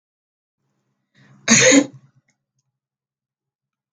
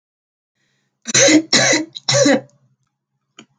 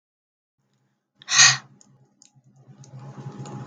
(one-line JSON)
{"cough_length": "3.9 s", "cough_amplitude": 32766, "cough_signal_mean_std_ratio": 0.25, "three_cough_length": "3.6 s", "three_cough_amplitude": 32768, "three_cough_signal_mean_std_ratio": 0.44, "exhalation_length": "3.7 s", "exhalation_amplitude": 32535, "exhalation_signal_mean_std_ratio": 0.25, "survey_phase": "beta (2021-08-13 to 2022-03-07)", "age": "18-44", "gender": "Female", "wearing_mask": "No", "symptom_cough_any": true, "smoker_status": "Never smoked", "respiratory_condition_asthma": false, "respiratory_condition_other": false, "recruitment_source": "REACT", "submission_delay": "1 day", "covid_test_result": "Negative", "covid_test_method": "RT-qPCR", "influenza_a_test_result": "Negative", "influenza_b_test_result": "Negative"}